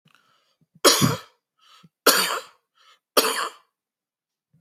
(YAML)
three_cough_length: 4.6 s
three_cough_amplitude: 32767
three_cough_signal_mean_std_ratio: 0.33
survey_phase: beta (2021-08-13 to 2022-03-07)
age: 45-64
gender: Male
wearing_mask: 'No'
symptom_none: true
smoker_status: Never smoked
respiratory_condition_asthma: false
respiratory_condition_other: false
recruitment_source: REACT
submission_delay: 2 days
covid_test_result: Negative
covid_test_method: RT-qPCR